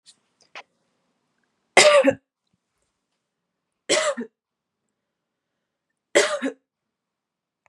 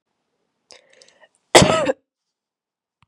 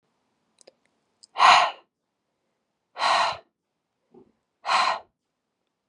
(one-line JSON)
{"three_cough_length": "7.7 s", "three_cough_amplitude": 32577, "three_cough_signal_mean_std_ratio": 0.26, "cough_length": "3.1 s", "cough_amplitude": 32768, "cough_signal_mean_std_ratio": 0.24, "exhalation_length": "5.9 s", "exhalation_amplitude": 25782, "exhalation_signal_mean_std_ratio": 0.31, "survey_phase": "beta (2021-08-13 to 2022-03-07)", "age": "18-44", "gender": "Female", "wearing_mask": "No", "symptom_none": true, "smoker_status": "Never smoked", "respiratory_condition_asthma": false, "respiratory_condition_other": false, "recruitment_source": "REACT", "submission_delay": "1 day", "covid_test_result": "Negative", "covid_test_method": "RT-qPCR", "influenza_a_test_result": "Negative", "influenza_b_test_result": "Negative"}